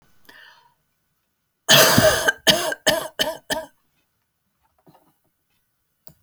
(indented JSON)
{
  "cough_length": "6.2 s",
  "cough_amplitude": 32768,
  "cough_signal_mean_std_ratio": 0.34,
  "survey_phase": "beta (2021-08-13 to 2022-03-07)",
  "age": "65+",
  "gender": "Female",
  "wearing_mask": "No",
  "symptom_cough_any": true,
  "smoker_status": "Never smoked",
  "respiratory_condition_asthma": false,
  "respiratory_condition_other": true,
  "recruitment_source": "REACT",
  "submission_delay": "2 days",
  "covid_test_result": "Negative",
  "covid_test_method": "RT-qPCR"
}